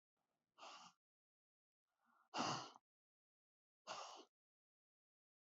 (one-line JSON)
{"exhalation_length": "5.5 s", "exhalation_amplitude": 929, "exhalation_signal_mean_std_ratio": 0.28, "survey_phase": "beta (2021-08-13 to 2022-03-07)", "age": "65+", "gender": "Female", "wearing_mask": "No", "symptom_none": true, "smoker_status": "Never smoked", "respiratory_condition_asthma": false, "respiratory_condition_other": false, "recruitment_source": "REACT", "submission_delay": "0 days", "covid_test_result": "Negative", "covid_test_method": "RT-qPCR", "influenza_a_test_result": "Negative", "influenza_b_test_result": "Negative"}